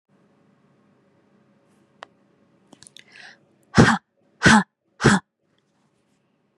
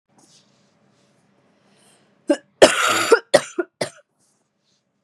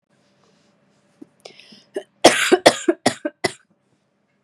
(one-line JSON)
{"exhalation_length": "6.6 s", "exhalation_amplitude": 30552, "exhalation_signal_mean_std_ratio": 0.23, "three_cough_length": "5.0 s", "three_cough_amplitude": 32768, "three_cough_signal_mean_std_ratio": 0.27, "cough_length": "4.4 s", "cough_amplitude": 32768, "cough_signal_mean_std_ratio": 0.26, "survey_phase": "beta (2021-08-13 to 2022-03-07)", "age": "18-44", "gender": "Female", "wearing_mask": "No", "symptom_cough_any": true, "symptom_shortness_of_breath": true, "symptom_fatigue": true, "symptom_headache": true, "symptom_change_to_sense_of_smell_or_taste": true, "symptom_loss_of_taste": true, "symptom_onset": "5 days", "smoker_status": "Never smoked", "respiratory_condition_asthma": true, "respiratory_condition_other": false, "recruitment_source": "Test and Trace", "submission_delay": "1 day", "covid_test_result": "Positive", "covid_test_method": "RT-qPCR", "covid_ct_value": 24.8, "covid_ct_gene": "ORF1ab gene", "covid_ct_mean": 25.2, "covid_viral_load": "5600 copies/ml", "covid_viral_load_category": "Minimal viral load (< 10K copies/ml)"}